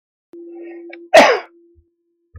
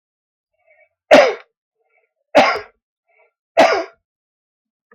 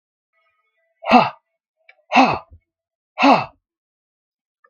{
  "cough_length": "2.4 s",
  "cough_amplitude": 32768,
  "cough_signal_mean_std_ratio": 0.3,
  "three_cough_length": "4.9 s",
  "three_cough_amplitude": 32768,
  "three_cough_signal_mean_std_ratio": 0.29,
  "exhalation_length": "4.7 s",
  "exhalation_amplitude": 32766,
  "exhalation_signal_mean_std_ratio": 0.3,
  "survey_phase": "beta (2021-08-13 to 2022-03-07)",
  "age": "45-64",
  "gender": "Male",
  "wearing_mask": "No",
  "symptom_cough_any": true,
  "symptom_runny_or_blocked_nose": true,
  "symptom_sore_throat": true,
  "smoker_status": "Ex-smoker",
  "respiratory_condition_asthma": false,
  "respiratory_condition_other": false,
  "recruitment_source": "Test and Trace",
  "submission_delay": "2 days",
  "covid_test_result": "Positive",
  "covid_test_method": "RT-qPCR",
  "covid_ct_value": 29.9,
  "covid_ct_gene": "ORF1ab gene",
  "covid_ct_mean": 30.9,
  "covid_viral_load": "75 copies/ml",
  "covid_viral_load_category": "Minimal viral load (< 10K copies/ml)"
}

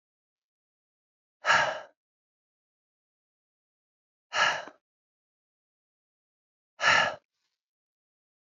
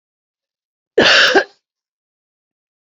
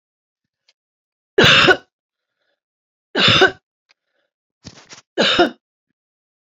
{
  "exhalation_length": "8.5 s",
  "exhalation_amplitude": 11655,
  "exhalation_signal_mean_std_ratio": 0.25,
  "cough_length": "2.9 s",
  "cough_amplitude": 29810,
  "cough_signal_mean_std_ratio": 0.32,
  "three_cough_length": "6.5 s",
  "three_cough_amplitude": 32768,
  "three_cough_signal_mean_std_ratio": 0.32,
  "survey_phase": "beta (2021-08-13 to 2022-03-07)",
  "age": "45-64",
  "gender": "Female",
  "wearing_mask": "No",
  "symptom_cough_any": true,
  "symptom_sore_throat": true,
  "symptom_onset": "12 days",
  "smoker_status": "Never smoked",
  "respiratory_condition_asthma": false,
  "respiratory_condition_other": false,
  "recruitment_source": "REACT",
  "submission_delay": "2 days",
  "covid_test_result": "Negative",
  "covid_test_method": "RT-qPCR",
  "influenza_a_test_result": "Negative",
  "influenza_b_test_result": "Negative"
}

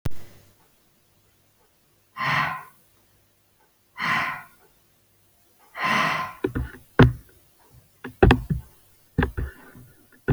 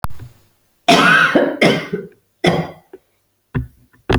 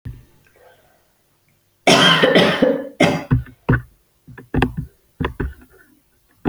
{
  "exhalation_length": "10.3 s",
  "exhalation_amplitude": 27085,
  "exhalation_signal_mean_std_ratio": 0.35,
  "cough_length": "4.2 s",
  "cough_amplitude": 30884,
  "cough_signal_mean_std_ratio": 0.5,
  "three_cough_length": "6.5 s",
  "three_cough_amplitude": 32726,
  "three_cough_signal_mean_std_ratio": 0.43,
  "survey_phase": "beta (2021-08-13 to 2022-03-07)",
  "age": "45-64",
  "gender": "Female",
  "wearing_mask": "No",
  "symptom_cough_any": true,
  "symptom_runny_or_blocked_nose": true,
  "symptom_sore_throat": true,
  "symptom_fatigue": true,
  "symptom_headache": true,
  "symptom_other": true,
  "symptom_onset": "6 days",
  "smoker_status": "Prefer not to say",
  "respiratory_condition_asthma": false,
  "respiratory_condition_other": false,
  "recruitment_source": "Test and Trace",
  "submission_delay": "4 days",
  "covid_test_result": "Positive",
  "covid_test_method": "ePCR"
}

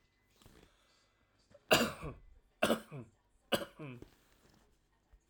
{
  "cough_length": "5.3 s",
  "cough_amplitude": 6221,
  "cough_signal_mean_std_ratio": 0.28,
  "survey_phase": "alpha (2021-03-01 to 2021-08-12)",
  "age": "65+",
  "gender": "Male",
  "wearing_mask": "No",
  "symptom_none": true,
  "smoker_status": "Never smoked",
  "respiratory_condition_asthma": false,
  "respiratory_condition_other": true,
  "recruitment_source": "REACT",
  "submission_delay": "2 days",
  "covid_test_result": "Negative",
  "covid_test_method": "RT-qPCR"
}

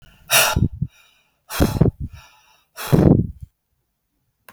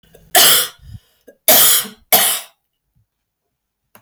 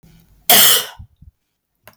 {
  "exhalation_length": "4.5 s",
  "exhalation_amplitude": 32768,
  "exhalation_signal_mean_std_ratio": 0.39,
  "three_cough_length": "4.0 s",
  "three_cough_amplitude": 32768,
  "three_cough_signal_mean_std_ratio": 0.41,
  "cough_length": "2.0 s",
  "cough_amplitude": 32768,
  "cough_signal_mean_std_ratio": 0.36,
  "survey_phase": "beta (2021-08-13 to 2022-03-07)",
  "age": "45-64",
  "gender": "Female",
  "wearing_mask": "No",
  "symptom_cough_any": true,
  "symptom_runny_or_blocked_nose": true,
  "smoker_status": "Never smoked",
  "respiratory_condition_asthma": false,
  "respiratory_condition_other": false,
  "recruitment_source": "REACT",
  "submission_delay": "0 days",
  "covid_test_result": "Negative",
  "covid_test_method": "RT-qPCR",
  "influenza_a_test_result": "Negative",
  "influenza_b_test_result": "Negative"
}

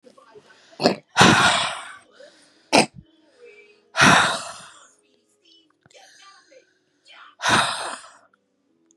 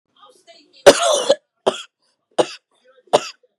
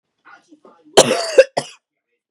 {
  "exhalation_length": "9.0 s",
  "exhalation_amplitude": 32739,
  "exhalation_signal_mean_std_ratio": 0.35,
  "three_cough_length": "3.6 s",
  "three_cough_amplitude": 32768,
  "three_cough_signal_mean_std_ratio": 0.3,
  "cough_length": "2.3 s",
  "cough_amplitude": 32768,
  "cough_signal_mean_std_ratio": 0.29,
  "survey_phase": "beta (2021-08-13 to 2022-03-07)",
  "age": "18-44",
  "gender": "Female",
  "wearing_mask": "No",
  "symptom_none": true,
  "smoker_status": "Never smoked",
  "respiratory_condition_asthma": false,
  "respiratory_condition_other": false,
  "recruitment_source": "REACT",
  "submission_delay": "2 days",
  "covid_test_result": "Negative",
  "covid_test_method": "RT-qPCR",
  "influenza_a_test_result": "Negative",
  "influenza_b_test_result": "Negative"
}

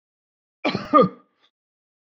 {
  "cough_length": "2.1 s",
  "cough_amplitude": 24238,
  "cough_signal_mean_std_ratio": 0.28,
  "survey_phase": "beta (2021-08-13 to 2022-03-07)",
  "age": "45-64",
  "gender": "Male",
  "wearing_mask": "No",
  "symptom_none": true,
  "smoker_status": "Never smoked",
  "respiratory_condition_asthma": false,
  "respiratory_condition_other": false,
  "recruitment_source": "REACT",
  "submission_delay": "1 day",
  "covid_test_result": "Negative",
  "covid_test_method": "RT-qPCR"
}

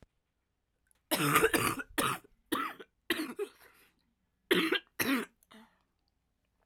{
  "cough_length": "6.7 s",
  "cough_amplitude": 8562,
  "cough_signal_mean_std_ratio": 0.41,
  "survey_phase": "alpha (2021-03-01 to 2021-08-12)",
  "age": "18-44",
  "gender": "Female",
  "wearing_mask": "No",
  "symptom_cough_any": true,
  "symptom_new_continuous_cough": true,
  "symptom_shortness_of_breath": true,
  "symptom_fatigue": true,
  "symptom_fever_high_temperature": true,
  "symptom_headache": true,
  "symptom_change_to_sense_of_smell_or_taste": true,
  "symptom_loss_of_taste": true,
  "symptom_onset": "5 days",
  "smoker_status": "Never smoked",
  "respiratory_condition_asthma": false,
  "respiratory_condition_other": false,
  "recruitment_source": "Test and Trace",
  "submission_delay": "2 days",
  "covid_test_result": "Positive",
  "covid_test_method": "RT-qPCR",
  "covid_ct_value": 23.0,
  "covid_ct_gene": "N gene"
}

